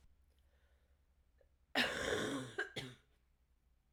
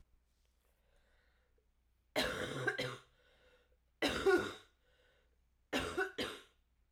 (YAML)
cough_length: 3.9 s
cough_amplitude: 3143
cough_signal_mean_std_ratio: 0.41
three_cough_length: 6.9 s
three_cough_amplitude: 3199
three_cough_signal_mean_std_ratio: 0.39
survey_phase: beta (2021-08-13 to 2022-03-07)
age: 18-44
gender: Female
wearing_mask: 'No'
symptom_cough_any: true
symptom_new_continuous_cough: true
symptom_runny_or_blocked_nose: true
symptom_sore_throat: true
symptom_fatigue: true
symptom_headache: true
symptom_other: true
symptom_onset: 3 days
smoker_status: Never smoked
respiratory_condition_asthma: false
respiratory_condition_other: false
recruitment_source: Test and Trace
submission_delay: 2 days
covid_test_result: Positive
covid_test_method: RT-qPCR
covid_ct_value: 13.9
covid_ct_gene: ORF1ab gene
covid_ct_mean: 14.4
covid_viral_load: 19000000 copies/ml
covid_viral_load_category: High viral load (>1M copies/ml)